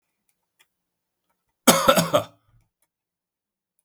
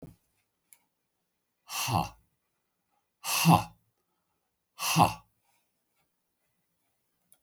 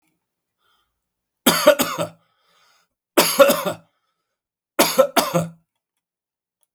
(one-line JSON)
{"cough_length": "3.8 s", "cough_amplitude": 32768, "cough_signal_mean_std_ratio": 0.25, "exhalation_length": "7.4 s", "exhalation_amplitude": 15386, "exhalation_signal_mean_std_ratio": 0.26, "three_cough_length": "6.7 s", "three_cough_amplitude": 32768, "three_cough_signal_mean_std_ratio": 0.34, "survey_phase": "beta (2021-08-13 to 2022-03-07)", "age": "65+", "gender": "Male", "wearing_mask": "No", "symptom_none": true, "smoker_status": "Ex-smoker", "respiratory_condition_asthma": false, "respiratory_condition_other": false, "recruitment_source": "REACT", "submission_delay": "1 day", "covid_test_result": "Negative", "covid_test_method": "RT-qPCR", "influenza_a_test_result": "Negative", "influenza_b_test_result": "Negative"}